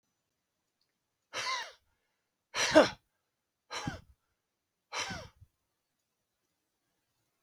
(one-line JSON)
{"exhalation_length": "7.4 s", "exhalation_amplitude": 14210, "exhalation_signal_mean_std_ratio": 0.22, "survey_phase": "beta (2021-08-13 to 2022-03-07)", "age": "65+", "gender": "Male", "wearing_mask": "No", "symptom_cough_any": true, "symptom_runny_or_blocked_nose": true, "smoker_status": "Never smoked", "respiratory_condition_asthma": false, "respiratory_condition_other": false, "recruitment_source": "REACT", "submission_delay": "1 day", "covid_test_result": "Negative", "covid_test_method": "RT-qPCR", "influenza_a_test_result": "Negative", "influenza_b_test_result": "Negative"}